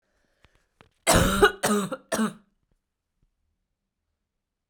{
  "cough_length": "4.7 s",
  "cough_amplitude": 18340,
  "cough_signal_mean_std_ratio": 0.33,
  "survey_phase": "beta (2021-08-13 to 2022-03-07)",
  "age": "18-44",
  "gender": "Female",
  "wearing_mask": "No",
  "symptom_cough_any": true,
  "symptom_runny_or_blocked_nose": true,
  "symptom_shortness_of_breath": true,
  "symptom_fatigue": true,
  "symptom_other": true,
  "symptom_onset": "3 days",
  "smoker_status": "Never smoked",
  "respiratory_condition_asthma": true,
  "respiratory_condition_other": false,
  "recruitment_source": "Test and Trace",
  "submission_delay": "1 day",
  "covid_test_result": "Positive",
  "covid_test_method": "RT-qPCR",
  "covid_ct_value": 16.6,
  "covid_ct_gene": "ORF1ab gene",
  "covid_ct_mean": 17.0,
  "covid_viral_load": "2800000 copies/ml",
  "covid_viral_load_category": "High viral load (>1M copies/ml)"
}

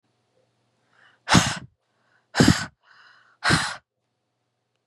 {
  "exhalation_length": "4.9 s",
  "exhalation_amplitude": 26606,
  "exhalation_signal_mean_std_ratio": 0.29,
  "survey_phase": "beta (2021-08-13 to 2022-03-07)",
  "age": "18-44",
  "gender": "Female",
  "wearing_mask": "No",
  "symptom_none": true,
  "smoker_status": "Never smoked",
  "respiratory_condition_asthma": false,
  "respiratory_condition_other": false,
  "recruitment_source": "Test and Trace",
  "submission_delay": "2 days",
  "covid_test_result": "Negative",
  "covid_test_method": "RT-qPCR"
}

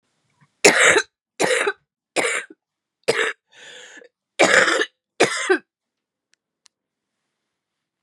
{
  "cough_length": "8.0 s",
  "cough_amplitude": 32768,
  "cough_signal_mean_std_ratio": 0.37,
  "survey_phase": "beta (2021-08-13 to 2022-03-07)",
  "age": "18-44",
  "gender": "Female",
  "wearing_mask": "No",
  "symptom_cough_any": true,
  "symptom_new_continuous_cough": true,
  "symptom_runny_or_blocked_nose": true,
  "symptom_sore_throat": true,
  "symptom_diarrhoea": true,
  "symptom_fatigue": true,
  "symptom_fever_high_temperature": true,
  "symptom_headache": true,
  "symptom_change_to_sense_of_smell_or_taste": true,
  "symptom_loss_of_taste": true,
  "symptom_onset": "5 days",
  "smoker_status": "Never smoked",
  "respiratory_condition_asthma": false,
  "respiratory_condition_other": false,
  "recruitment_source": "Test and Trace",
  "submission_delay": "1 day",
  "covid_test_result": "Positive",
  "covid_test_method": "RT-qPCR",
  "covid_ct_value": 18.1,
  "covid_ct_gene": "N gene",
  "covid_ct_mean": 18.5,
  "covid_viral_load": "870000 copies/ml",
  "covid_viral_load_category": "Low viral load (10K-1M copies/ml)"
}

